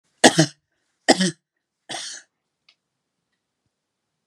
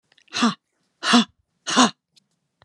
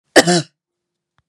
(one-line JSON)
{"three_cough_length": "4.3 s", "three_cough_amplitude": 32768, "three_cough_signal_mean_std_ratio": 0.22, "exhalation_length": "2.6 s", "exhalation_amplitude": 29072, "exhalation_signal_mean_std_ratio": 0.36, "cough_length": "1.3 s", "cough_amplitude": 32768, "cough_signal_mean_std_ratio": 0.31, "survey_phase": "beta (2021-08-13 to 2022-03-07)", "age": "45-64", "gender": "Female", "wearing_mask": "No", "symptom_none": true, "smoker_status": "Never smoked", "respiratory_condition_asthma": false, "respiratory_condition_other": false, "recruitment_source": "Test and Trace", "submission_delay": "2 days", "covid_test_result": "Negative", "covid_test_method": "RT-qPCR"}